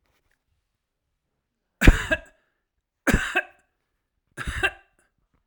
{"three_cough_length": "5.5 s", "three_cough_amplitude": 32767, "three_cough_signal_mean_std_ratio": 0.23, "survey_phase": "alpha (2021-03-01 to 2021-08-12)", "age": "45-64", "gender": "Male", "wearing_mask": "No", "symptom_none": true, "smoker_status": "Ex-smoker", "respiratory_condition_asthma": false, "respiratory_condition_other": false, "recruitment_source": "REACT", "submission_delay": "1 day", "covid_test_result": "Negative", "covid_test_method": "RT-qPCR"}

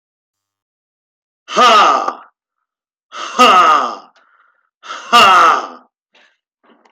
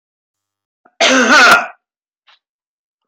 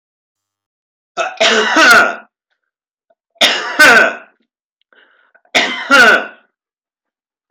{"exhalation_length": "6.9 s", "exhalation_amplitude": 32768, "exhalation_signal_mean_std_ratio": 0.44, "cough_length": "3.1 s", "cough_amplitude": 32768, "cough_signal_mean_std_ratio": 0.4, "three_cough_length": "7.5 s", "three_cough_amplitude": 32768, "three_cough_signal_mean_std_ratio": 0.44, "survey_phase": "alpha (2021-03-01 to 2021-08-12)", "age": "45-64", "gender": "Male", "wearing_mask": "No", "symptom_none": true, "smoker_status": "Current smoker (1 to 10 cigarettes per day)", "respiratory_condition_asthma": false, "respiratory_condition_other": false, "recruitment_source": "REACT", "submission_delay": "2 days", "covid_test_result": "Negative", "covid_test_method": "RT-qPCR"}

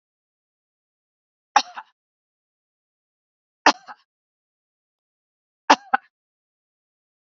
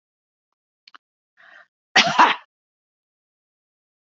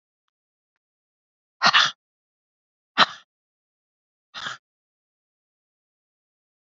{"three_cough_length": "7.3 s", "three_cough_amplitude": 30467, "three_cough_signal_mean_std_ratio": 0.12, "cough_length": "4.2 s", "cough_amplitude": 32768, "cough_signal_mean_std_ratio": 0.21, "exhalation_length": "6.7 s", "exhalation_amplitude": 28730, "exhalation_signal_mean_std_ratio": 0.18, "survey_phase": "beta (2021-08-13 to 2022-03-07)", "age": "65+", "gender": "Female", "wearing_mask": "No", "symptom_none": true, "smoker_status": "Current smoker (1 to 10 cigarettes per day)", "respiratory_condition_asthma": false, "respiratory_condition_other": false, "recruitment_source": "REACT", "submission_delay": "2 days", "covid_test_result": "Negative", "covid_test_method": "RT-qPCR", "influenza_a_test_result": "Negative", "influenza_b_test_result": "Negative"}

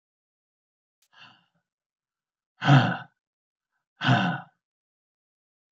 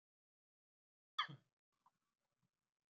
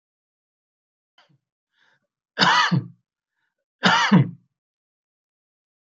{"exhalation_length": "5.7 s", "exhalation_amplitude": 18536, "exhalation_signal_mean_std_ratio": 0.26, "cough_length": "2.9 s", "cough_amplitude": 1786, "cough_signal_mean_std_ratio": 0.14, "three_cough_length": "5.8 s", "three_cough_amplitude": 32595, "three_cough_signal_mean_std_ratio": 0.31, "survey_phase": "beta (2021-08-13 to 2022-03-07)", "age": "65+", "gender": "Male", "wearing_mask": "No", "symptom_fatigue": true, "smoker_status": "Ex-smoker", "respiratory_condition_asthma": false, "respiratory_condition_other": false, "recruitment_source": "REACT", "submission_delay": "2 days", "covid_test_result": "Negative", "covid_test_method": "RT-qPCR", "influenza_a_test_result": "Negative", "influenza_b_test_result": "Negative"}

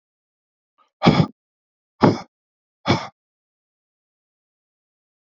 {"exhalation_length": "5.3 s", "exhalation_amplitude": 27825, "exhalation_signal_mean_std_ratio": 0.23, "survey_phase": "beta (2021-08-13 to 2022-03-07)", "age": "45-64", "gender": "Male", "wearing_mask": "No", "symptom_none": true, "symptom_onset": "7 days", "smoker_status": "Ex-smoker", "respiratory_condition_asthma": false, "respiratory_condition_other": false, "recruitment_source": "REACT", "submission_delay": "2 days", "covid_test_result": "Negative", "covid_test_method": "RT-qPCR"}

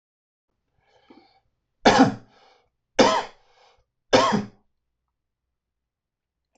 {"three_cough_length": "6.6 s", "three_cough_amplitude": 23799, "three_cough_signal_mean_std_ratio": 0.27, "survey_phase": "alpha (2021-03-01 to 2021-08-12)", "age": "18-44", "gender": "Male", "wearing_mask": "No", "symptom_none": true, "smoker_status": "Ex-smoker", "respiratory_condition_asthma": false, "respiratory_condition_other": false, "recruitment_source": "REACT", "submission_delay": "1 day", "covid_test_result": "Negative", "covid_test_method": "RT-qPCR"}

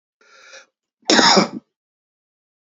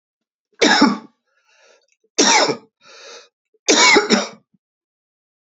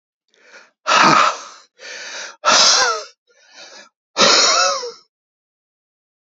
{"cough_length": "2.7 s", "cough_amplitude": 32768, "cough_signal_mean_std_ratio": 0.32, "three_cough_length": "5.5 s", "three_cough_amplitude": 31943, "three_cough_signal_mean_std_ratio": 0.4, "exhalation_length": "6.2 s", "exhalation_amplitude": 32767, "exhalation_signal_mean_std_ratio": 0.46, "survey_phase": "beta (2021-08-13 to 2022-03-07)", "age": "65+", "gender": "Male", "wearing_mask": "No", "symptom_cough_any": true, "symptom_headache": true, "symptom_other": true, "smoker_status": "Ex-smoker", "respiratory_condition_asthma": false, "respiratory_condition_other": false, "recruitment_source": "Test and Trace", "submission_delay": "1 day", "covid_test_result": "Positive", "covid_test_method": "RT-qPCR"}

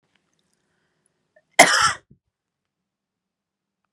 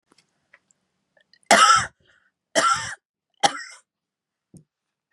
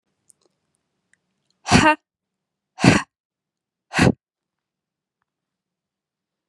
{"cough_length": "3.9 s", "cough_amplitude": 32768, "cough_signal_mean_std_ratio": 0.2, "three_cough_length": "5.1 s", "three_cough_amplitude": 29750, "three_cough_signal_mean_std_ratio": 0.29, "exhalation_length": "6.5 s", "exhalation_amplitude": 32767, "exhalation_signal_mean_std_ratio": 0.23, "survey_phase": "beta (2021-08-13 to 2022-03-07)", "age": "18-44", "gender": "Female", "wearing_mask": "No", "symptom_none": true, "smoker_status": "Never smoked", "respiratory_condition_asthma": false, "respiratory_condition_other": false, "recruitment_source": "REACT", "submission_delay": "2 days", "covid_test_result": "Negative", "covid_test_method": "RT-qPCR", "influenza_a_test_result": "Negative", "influenza_b_test_result": "Negative"}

